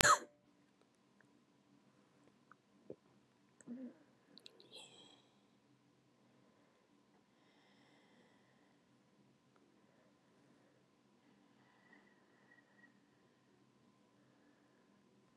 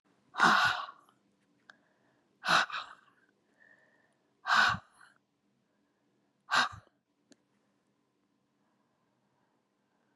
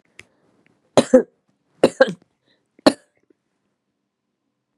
{"cough_length": "15.4 s", "cough_amplitude": 22545, "cough_signal_mean_std_ratio": 0.15, "exhalation_length": "10.2 s", "exhalation_amplitude": 9431, "exhalation_signal_mean_std_ratio": 0.28, "three_cough_length": "4.8 s", "three_cough_amplitude": 32768, "three_cough_signal_mean_std_ratio": 0.19, "survey_phase": "beta (2021-08-13 to 2022-03-07)", "age": "65+", "gender": "Female", "wearing_mask": "No", "symptom_runny_or_blocked_nose": true, "symptom_headache": true, "smoker_status": "Ex-smoker", "respiratory_condition_asthma": false, "respiratory_condition_other": false, "recruitment_source": "REACT", "submission_delay": "2 days", "covid_test_result": "Negative", "covid_test_method": "RT-qPCR", "influenza_a_test_result": "Negative", "influenza_b_test_result": "Negative"}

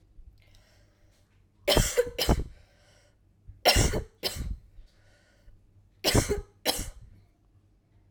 {"three_cough_length": "8.1 s", "three_cough_amplitude": 14572, "three_cough_signal_mean_std_ratio": 0.37, "survey_phase": "alpha (2021-03-01 to 2021-08-12)", "age": "18-44", "gender": "Female", "wearing_mask": "No", "symptom_shortness_of_breath": true, "symptom_abdominal_pain": true, "symptom_fatigue": true, "symptom_fever_high_temperature": true, "symptom_headache": true, "symptom_change_to_sense_of_smell_or_taste": true, "symptom_loss_of_taste": true, "symptom_onset": "3 days", "smoker_status": "Never smoked", "respiratory_condition_asthma": false, "respiratory_condition_other": false, "recruitment_source": "Test and Trace", "submission_delay": "2 days", "covid_test_result": "Positive", "covid_test_method": "RT-qPCR", "covid_ct_value": 16.5, "covid_ct_gene": "ORF1ab gene", "covid_ct_mean": 16.7, "covid_viral_load": "3300000 copies/ml", "covid_viral_load_category": "High viral load (>1M copies/ml)"}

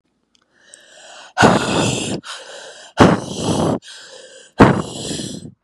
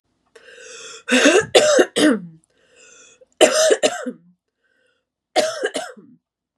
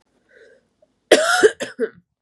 {"exhalation_length": "5.6 s", "exhalation_amplitude": 32768, "exhalation_signal_mean_std_ratio": 0.46, "three_cough_length": "6.6 s", "three_cough_amplitude": 32768, "three_cough_signal_mean_std_ratio": 0.43, "cough_length": "2.2 s", "cough_amplitude": 32768, "cough_signal_mean_std_ratio": 0.35, "survey_phase": "beta (2021-08-13 to 2022-03-07)", "age": "18-44", "gender": "Female", "wearing_mask": "No", "symptom_cough_any": true, "symptom_runny_or_blocked_nose": true, "symptom_headache": true, "symptom_change_to_sense_of_smell_or_taste": true, "smoker_status": "Never smoked", "respiratory_condition_asthma": false, "respiratory_condition_other": false, "recruitment_source": "Test and Trace", "submission_delay": "2 days", "covid_test_result": "Positive", "covid_test_method": "RT-qPCR", "covid_ct_value": 26.6, "covid_ct_gene": "ORF1ab gene"}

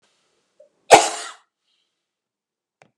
{"cough_length": "3.0 s", "cough_amplitude": 32768, "cough_signal_mean_std_ratio": 0.18, "survey_phase": "beta (2021-08-13 to 2022-03-07)", "age": "45-64", "gender": "Female", "wearing_mask": "No", "symptom_cough_any": true, "symptom_shortness_of_breath": true, "smoker_status": "Never smoked", "respiratory_condition_asthma": false, "respiratory_condition_other": true, "recruitment_source": "REACT", "submission_delay": "1 day", "covid_test_result": "Negative", "covid_test_method": "RT-qPCR"}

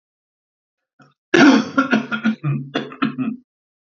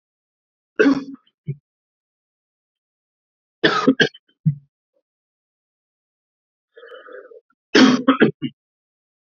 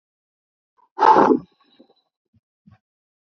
{"cough_length": "3.9 s", "cough_amplitude": 28680, "cough_signal_mean_std_ratio": 0.44, "three_cough_length": "9.3 s", "three_cough_amplitude": 29090, "three_cough_signal_mean_std_ratio": 0.28, "exhalation_length": "3.2 s", "exhalation_amplitude": 29684, "exhalation_signal_mean_std_ratio": 0.27, "survey_phase": "beta (2021-08-13 to 2022-03-07)", "age": "45-64", "gender": "Male", "wearing_mask": "No", "symptom_none": true, "smoker_status": "Ex-smoker", "respiratory_condition_asthma": false, "respiratory_condition_other": false, "recruitment_source": "REACT", "submission_delay": "1 day", "covid_test_result": "Negative", "covid_test_method": "RT-qPCR", "influenza_a_test_result": "Negative", "influenza_b_test_result": "Negative"}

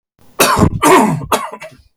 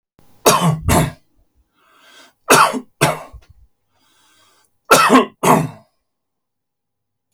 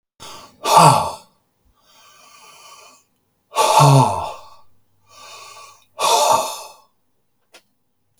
{"cough_length": "2.0 s", "cough_amplitude": 32768, "cough_signal_mean_std_ratio": 0.6, "three_cough_length": "7.3 s", "three_cough_amplitude": 32768, "three_cough_signal_mean_std_ratio": 0.38, "exhalation_length": "8.2 s", "exhalation_amplitude": 32768, "exhalation_signal_mean_std_ratio": 0.38, "survey_phase": "beta (2021-08-13 to 2022-03-07)", "age": "45-64", "gender": "Male", "wearing_mask": "No", "symptom_headache": true, "symptom_change_to_sense_of_smell_or_taste": true, "symptom_other": true, "symptom_onset": "3 days", "smoker_status": "Never smoked", "respiratory_condition_asthma": true, "respiratory_condition_other": false, "recruitment_source": "REACT", "submission_delay": "2 days", "covid_test_result": "Negative", "covid_test_method": "RT-qPCR", "influenza_a_test_result": "Negative", "influenza_b_test_result": "Negative"}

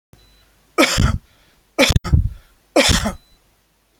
{"three_cough_length": "4.0 s", "three_cough_amplitude": 30242, "three_cough_signal_mean_std_ratio": 0.41, "survey_phase": "beta (2021-08-13 to 2022-03-07)", "age": "65+", "gender": "Male", "wearing_mask": "No", "symptom_none": true, "smoker_status": "Ex-smoker", "respiratory_condition_asthma": false, "respiratory_condition_other": false, "recruitment_source": "REACT", "submission_delay": "1 day", "covid_test_result": "Negative", "covid_test_method": "RT-qPCR", "influenza_a_test_result": "Negative", "influenza_b_test_result": "Negative"}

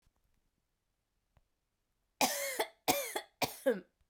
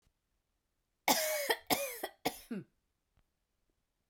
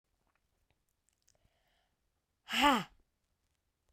{"three_cough_length": "4.1 s", "three_cough_amplitude": 7059, "three_cough_signal_mean_std_ratio": 0.35, "cough_length": "4.1 s", "cough_amplitude": 6688, "cough_signal_mean_std_ratio": 0.36, "exhalation_length": "3.9 s", "exhalation_amplitude": 8025, "exhalation_signal_mean_std_ratio": 0.21, "survey_phase": "beta (2021-08-13 to 2022-03-07)", "age": "18-44", "gender": "Female", "wearing_mask": "No", "symptom_cough_any": true, "symptom_runny_or_blocked_nose": true, "symptom_shortness_of_breath": true, "symptom_sore_throat": true, "symptom_fever_high_temperature": true, "symptom_loss_of_taste": true, "smoker_status": "Never smoked", "respiratory_condition_asthma": false, "respiratory_condition_other": false, "recruitment_source": "Test and Trace", "submission_delay": "2 days", "covid_test_result": "Positive", "covid_test_method": "RT-qPCR", "covid_ct_value": 21.0, "covid_ct_gene": "ORF1ab gene", "covid_ct_mean": 21.4, "covid_viral_load": "98000 copies/ml", "covid_viral_load_category": "Low viral load (10K-1M copies/ml)"}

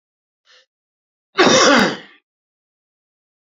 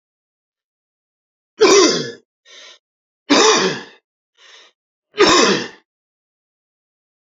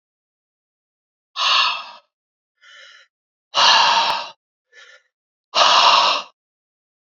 {"cough_length": "3.4 s", "cough_amplitude": 32767, "cough_signal_mean_std_ratio": 0.33, "three_cough_length": "7.3 s", "three_cough_amplitude": 31096, "three_cough_signal_mean_std_ratio": 0.36, "exhalation_length": "7.1 s", "exhalation_amplitude": 29591, "exhalation_signal_mean_std_ratio": 0.41, "survey_phase": "beta (2021-08-13 to 2022-03-07)", "age": "45-64", "gender": "Male", "wearing_mask": "No", "symptom_none": true, "smoker_status": "Current smoker (1 to 10 cigarettes per day)", "respiratory_condition_asthma": false, "respiratory_condition_other": false, "recruitment_source": "REACT", "submission_delay": "0 days", "covid_test_result": "Negative", "covid_test_method": "RT-qPCR", "influenza_a_test_result": "Unknown/Void", "influenza_b_test_result": "Unknown/Void"}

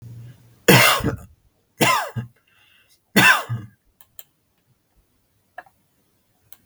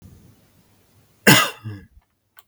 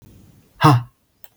{"three_cough_length": "6.7 s", "three_cough_amplitude": 32766, "three_cough_signal_mean_std_ratio": 0.32, "cough_length": "2.5 s", "cough_amplitude": 32768, "cough_signal_mean_std_ratio": 0.26, "exhalation_length": "1.4 s", "exhalation_amplitude": 32768, "exhalation_signal_mean_std_ratio": 0.32, "survey_phase": "beta (2021-08-13 to 2022-03-07)", "age": "45-64", "gender": "Male", "wearing_mask": "No", "symptom_runny_or_blocked_nose": true, "symptom_sore_throat": true, "smoker_status": "Never smoked", "respiratory_condition_asthma": false, "respiratory_condition_other": false, "recruitment_source": "REACT", "submission_delay": "1 day", "covid_test_result": "Negative", "covid_test_method": "RT-qPCR", "influenza_a_test_result": "Negative", "influenza_b_test_result": "Negative"}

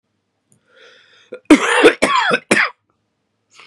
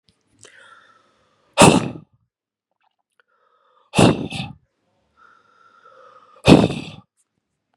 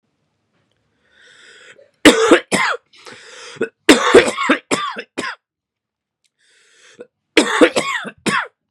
{"cough_length": "3.7 s", "cough_amplitude": 32768, "cough_signal_mean_std_ratio": 0.39, "exhalation_length": "7.8 s", "exhalation_amplitude": 32768, "exhalation_signal_mean_std_ratio": 0.25, "three_cough_length": "8.7 s", "three_cough_amplitude": 32768, "three_cough_signal_mean_std_ratio": 0.37, "survey_phase": "beta (2021-08-13 to 2022-03-07)", "age": "18-44", "gender": "Male", "wearing_mask": "No", "symptom_cough_any": true, "symptom_runny_or_blocked_nose": true, "symptom_shortness_of_breath": true, "symptom_sore_throat": true, "symptom_abdominal_pain": true, "symptom_fatigue": true, "symptom_fever_high_temperature": true, "symptom_headache": true, "symptom_loss_of_taste": true, "symptom_other": true, "symptom_onset": "3 days", "smoker_status": "Current smoker (1 to 10 cigarettes per day)", "respiratory_condition_asthma": false, "respiratory_condition_other": false, "recruitment_source": "Test and Trace", "submission_delay": "2 days", "covid_test_result": "Positive", "covid_test_method": "ePCR"}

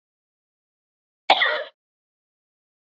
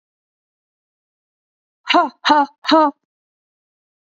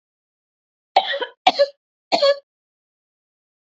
{"cough_length": "2.9 s", "cough_amplitude": 28625, "cough_signal_mean_std_ratio": 0.23, "exhalation_length": "4.1 s", "exhalation_amplitude": 27337, "exhalation_signal_mean_std_ratio": 0.31, "three_cough_length": "3.7 s", "three_cough_amplitude": 27780, "three_cough_signal_mean_std_ratio": 0.3, "survey_phase": "beta (2021-08-13 to 2022-03-07)", "age": "45-64", "gender": "Female", "wearing_mask": "No", "symptom_none": true, "smoker_status": "Never smoked", "respiratory_condition_asthma": true, "respiratory_condition_other": false, "recruitment_source": "REACT", "submission_delay": "2 days", "covid_test_result": "Negative", "covid_test_method": "RT-qPCR", "covid_ct_value": 39.0, "covid_ct_gene": "N gene", "influenza_a_test_result": "Negative", "influenza_b_test_result": "Negative"}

